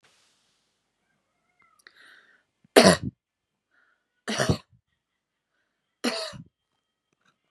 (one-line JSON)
{"three_cough_length": "7.5 s", "three_cough_amplitude": 30707, "three_cough_signal_mean_std_ratio": 0.2, "survey_phase": "beta (2021-08-13 to 2022-03-07)", "age": "18-44", "gender": "Female", "wearing_mask": "No", "symptom_runny_or_blocked_nose": true, "symptom_headache": true, "symptom_onset": "3 days", "smoker_status": "Never smoked", "respiratory_condition_asthma": true, "respiratory_condition_other": false, "recruitment_source": "REACT", "submission_delay": "1 day", "covid_test_result": "Positive", "covid_test_method": "RT-qPCR", "covid_ct_value": 18.0, "covid_ct_gene": "E gene", "influenza_a_test_result": "Negative", "influenza_b_test_result": "Negative"}